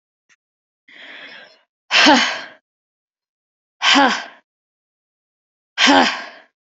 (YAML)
exhalation_length: 6.7 s
exhalation_amplitude: 30408
exhalation_signal_mean_std_ratio: 0.35
survey_phase: beta (2021-08-13 to 2022-03-07)
age: 18-44
gender: Female
wearing_mask: 'No'
symptom_cough_any: true
symptom_shortness_of_breath: true
symptom_sore_throat: true
symptom_fatigue: true
smoker_status: Current smoker (e-cigarettes or vapes only)
respiratory_condition_asthma: false
respiratory_condition_other: false
recruitment_source: Test and Trace
submission_delay: 1 day
covid_test_result: Positive
covid_test_method: RT-qPCR
covid_ct_value: 21.4
covid_ct_gene: N gene
covid_ct_mean: 22.3
covid_viral_load: 50000 copies/ml
covid_viral_load_category: Low viral load (10K-1M copies/ml)